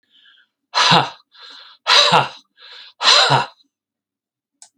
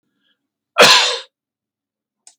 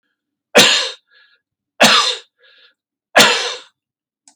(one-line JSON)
{"exhalation_length": "4.8 s", "exhalation_amplitude": 32768, "exhalation_signal_mean_std_ratio": 0.41, "cough_length": "2.4 s", "cough_amplitude": 32768, "cough_signal_mean_std_ratio": 0.31, "three_cough_length": "4.4 s", "three_cough_amplitude": 32768, "three_cough_signal_mean_std_ratio": 0.38, "survey_phase": "beta (2021-08-13 to 2022-03-07)", "age": "65+", "gender": "Male", "wearing_mask": "No", "symptom_none": true, "smoker_status": "Never smoked", "respiratory_condition_asthma": false, "respiratory_condition_other": false, "recruitment_source": "REACT", "submission_delay": "2 days", "covid_test_result": "Negative", "covid_test_method": "RT-qPCR", "influenza_a_test_result": "Negative", "influenza_b_test_result": "Negative"}